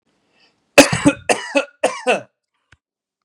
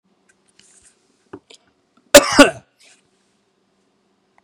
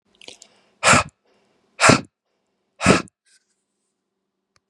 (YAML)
three_cough_length: 3.2 s
three_cough_amplitude: 32768
three_cough_signal_mean_std_ratio: 0.33
cough_length: 4.4 s
cough_amplitude: 32768
cough_signal_mean_std_ratio: 0.19
exhalation_length: 4.7 s
exhalation_amplitude: 32766
exhalation_signal_mean_std_ratio: 0.27
survey_phase: beta (2021-08-13 to 2022-03-07)
age: 18-44
gender: Male
wearing_mask: 'No'
symptom_none: true
smoker_status: Ex-smoker
respiratory_condition_asthma: false
respiratory_condition_other: false
recruitment_source: REACT
submission_delay: 1 day
covid_test_result: Negative
covid_test_method: RT-qPCR
influenza_a_test_result: Negative
influenza_b_test_result: Negative